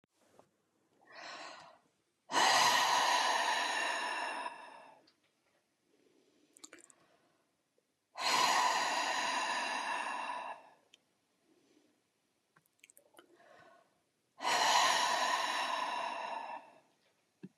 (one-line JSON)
{"exhalation_length": "17.6 s", "exhalation_amplitude": 4865, "exhalation_signal_mean_std_ratio": 0.52, "survey_phase": "beta (2021-08-13 to 2022-03-07)", "age": "45-64", "gender": "Female", "wearing_mask": "No", "symptom_runny_or_blocked_nose": true, "smoker_status": "Ex-smoker", "respiratory_condition_asthma": false, "respiratory_condition_other": false, "recruitment_source": "REACT", "submission_delay": "0 days", "covid_test_result": "Negative", "covid_test_method": "RT-qPCR"}